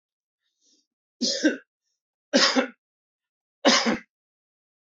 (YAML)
three_cough_length: 4.9 s
three_cough_amplitude: 22811
three_cough_signal_mean_std_ratio: 0.34
survey_phase: beta (2021-08-13 to 2022-03-07)
age: 45-64
gender: Male
wearing_mask: 'No'
symptom_cough_any: true
symptom_sore_throat: true
smoker_status: Ex-smoker
respiratory_condition_asthma: false
respiratory_condition_other: false
recruitment_source: REACT
submission_delay: 1 day
covid_test_result: Negative
covid_test_method: RT-qPCR
influenza_a_test_result: Negative
influenza_b_test_result: Negative